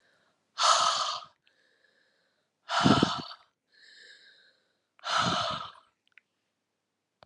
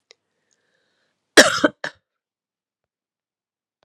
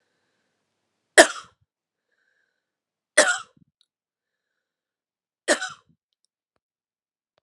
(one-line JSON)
{"exhalation_length": "7.3 s", "exhalation_amplitude": 13960, "exhalation_signal_mean_std_ratio": 0.37, "cough_length": "3.8 s", "cough_amplitude": 32768, "cough_signal_mean_std_ratio": 0.18, "three_cough_length": "7.4 s", "three_cough_amplitude": 32768, "three_cough_signal_mean_std_ratio": 0.16, "survey_phase": "alpha (2021-03-01 to 2021-08-12)", "age": "45-64", "gender": "Female", "wearing_mask": "No", "symptom_cough_any": true, "symptom_new_continuous_cough": true, "symptom_diarrhoea": true, "symptom_fatigue": true, "symptom_change_to_sense_of_smell_or_taste": true, "symptom_loss_of_taste": true, "smoker_status": "Never smoked", "respiratory_condition_asthma": false, "respiratory_condition_other": false, "recruitment_source": "Test and Trace", "submission_delay": "2 days", "covid_test_result": "Positive", "covid_test_method": "RT-qPCR", "covid_ct_value": 21.5, "covid_ct_gene": "ORF1ab gene", "covid_ct_mean": 21.8, "covid_viral_load": "68000 copies/ml", "covid_viral_load_category": "Low viral load (10K-1M copies/ml)"}